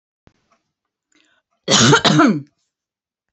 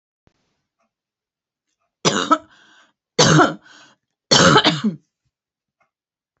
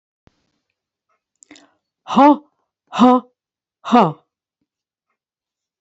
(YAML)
cough_length: 3.3 s
cough_amplitude: 30780
cough_signal_mean_std_ratio: 0.37
three_cough_length: 6.4 s
three_cough_amplitude: 32768
three_cough_signal_mean_std_ratio: 0.33
exhalation_length: 5.8 s
exhalation_amplitude: 31179
exhalation_signal_mean_std_ratio: 0.28
survey_phase: beta (2021-08-13 to 2022-03-07)
age: 45-64
gender: Female
wearing_mask: 'No'
symptom_fatigue: true
symptom_onset: 13 days
smoker_status: Never smoked
respiratory_condition_asthma: false
respiratory_condition_other: false
recruitment_source: REACT
submission_delay: 0 days
covid_test_result: Negative
covid_test_method: RT-qPCR
influenza_a_test_result: Negative
influenza_b_test_result: Negative